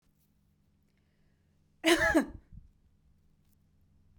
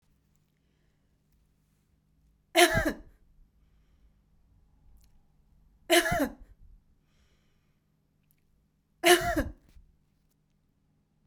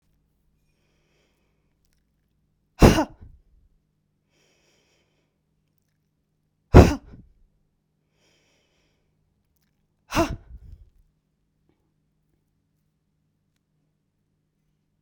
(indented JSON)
{
  "cough_length": "4.2 s",
  "cough_amplitude": 8950,
  "cough_signal_mean_std_ratio": 0.27,
  "three_cough_length": "11.3 s",
  "three_cough_amplitude": 18055,
  "three_cough_signal_mean_std_ratio": 0.25,
  "exhalation_length": "15.0 s",
  "exhalation_amplitude": 32768,
  "exhalation_signal_mean_std_ratio": 0.14,
  "survey_phase": "beta (2021-08-13 to 2022-03-07)",
  "age": "65+",
  "gender": "Female",
  "wearing_mask": "No",
  "symptom_none": true,
  "smoker_status": "Never smoked",
  "respiratory_condition_asthma": false,
  "respiratory_condition_other": false,
  "recruitment_source": "REACT",
  "submission_delay": "17 days",
  "covid_test_result": "Negative",
  "covid_test_method": "RT-qPCR"
}